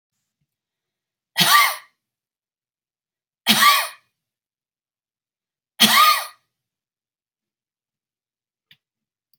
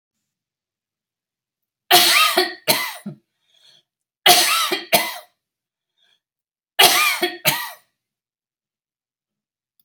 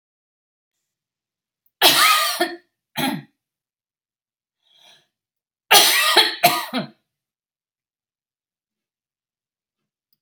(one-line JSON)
{"exhalation_length": "9.4 s", "exhalation_amplitude": 32767, "exhalation_signal_mean_std_ratio": 0.28, "three_cough_length": "9.8 s", "three_cough_amplitude": 32768, "three_cough_signal_mean_std_ratio": 0.36, "cough_length": "10.2 s", "cough_amplitude": 32768, "cough_signal_mean_std_ratio": 0.31, "survey_phase": "beta (2021-08-13 to 2022-03-07)", "age": "45-64", "gender": "Female", "wearing_mask": "No", "symptom_runny_or_blocked_nose": true, "symptom_sore_throat": true, "symptom_onset": "11 days", "smoker_status": "Never smoked", "respiratory_condition_asthma": false, "respiratory_condition_other": false, "recruitment_source": "REACT", "submission_delay": "3 days", "covid_test_result": "Negative", "covid_test_method": "RT-qPCR"}